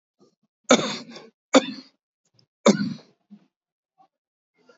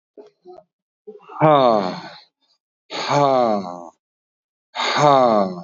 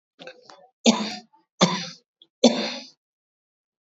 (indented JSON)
{
  "cough_length": "4.8 s",
  "cough_amplitude": 27702,
  "cough_signal_mean_std_ratio": 0.24,
  "exhalation_length": "5.6 s",
  "exhalation_amplitude": 26894,
  "exhalation_signal_mean_std_ratio": 0.49,
  "three_cough_length": "3.8 s",
  "three_cough_amplitude": 26757,
  "three_cough_signal_mean_std_ratio": 0.31,
  "survey_phase": "beta (2021-08-13 to 2022-03-07)",
  "age": "45-64",
  "gender": "Male",
  "wearing_mask": "No",
  "symptom_none": true,
  "smoker_status": "Ex-smoker",
  "respiratory_condition_asthma": false,
  "respiratory_condition_other": false,
  "recruitment_source": "REACT",
  "submission_delay": "0 days",
  "covid_test_result": "Negative",
  "covid_test_method": "RT-qPCR",
  "influenza_a_test_result": "Negative",
  "influenza_b_test_result": "Negative"
}